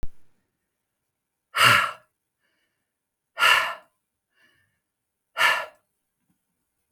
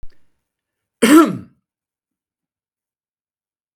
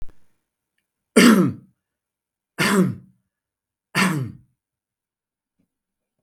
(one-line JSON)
{"exhalation_length": "6.9 s", "exhalation_amplitude": 25170, "exhalation_signal_mean_std_ratio": 0.3, "cough_length": "3.8 s", "cough_amplitude": 32768, "cough_signal_mean_std_ratio": 0.24, "three_cough_length": "6.2 s", "three_cough_amplitude": 32766, "three_cough_signal_mean_std_ratio": 0.32, "survey_phase": "beta (2021-08-13 to 2022-03-07)", "age": "45-64", "gender": "Male", "wearing_mask": "No", "symptom_none": true, "symptom_onset": "12 days", "smoker_status": "Ex-smoker", "respiratory_condition_asthma": false, "respiratory_condition_other": false, "recruitment_source": "REACT", "submission_delay": "5 days", "covid_test_result": "Negative", "covid_test_method": "RT-qPCR", "influenza_a_test_result": "Negative", "influenza_b_test_result": "Negative"}